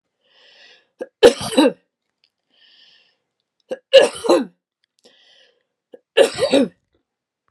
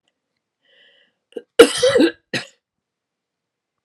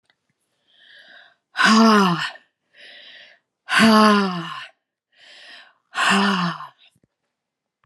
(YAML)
three_cough_length: 7.5 s
three_cough_amplitude: 32768
three_cough_signal_mean_std_ratio: 0.29
cough_length: 3.8 s
cough_amplitude: 32768
cough_signal_mean_std_ratio: 0.26
exhalation_length: 7.9 s
exhalation_amplitude: 30221
exhalation_signal_mean_std_ratio: 0.42
survey_phase: alpha (2021-03-01 to 2021-08-12)
age: 65+
gender: Female
wearing_mask: 'No'
symptom_none: true
smoker_status: Ex-smoker
respiratory_condition_asthma: false
respiratory_condition_other: false
recruitment_source: REACT
submission_delay: 1 day
covid_test_result: Negative
covid_test_method: RT-qPCR